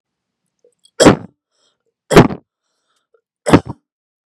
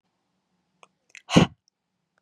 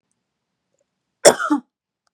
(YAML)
three_cough_length: 4.3 s
three_cough_amplitude: 32768
three_cough_signal_mean_std_ratio: 0.25
exhalation_length: 2.2 s
exhalation_amplitude: 28117
exhalation_signal_mean_std_ratio: 0.18
cough_length: 2.1 s
cough_amplitude: 32768
cough_signal_mean_std_ratio: 0.23
survey_phase: beta (2021-08-13 to 2022-03-07)
age: 18-44
gender: Female
wearing_mask: 'No'
symptom_fatigue: true
symptom_headache: true
symptom_onset: 4 days
smoker_status: Never smoked
respiratory_condition_asthma: false
respiratory_condition_other: false
recruitment_source: Test and Trace
submission_delay: 2 days
covid_test_result: Positive
covid_test_method: RT-qPCR
covid_ct_value: 16.3
covid_ct_gene: ORF1ab gene
covid_ct_mean: 16.5
covid_viral_load: 3800000 copies/ml
covid_viral_load_category: High viral load (>1M copies/ml)